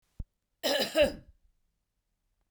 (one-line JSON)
{"cough_length": "2.5 s", "cough_amplitude": 6981, "cough_signal_mean_std_ratio": 0.34, "survey_phase": "beta (2021-08-13 to 2022-03-07)", "age": "45-64", "gender": "Female", "wearing_mask": "No", "symptom_none": true, "smoker_status": "Never smoked", "respiratory_condition_asthma": false, "respiratory_condition_other": false, "recruitment_source": "Test and Trace", "submission_delay": "1 day", "covid_test_result": "Negative", "covid_test_method": "RT-qPCR"}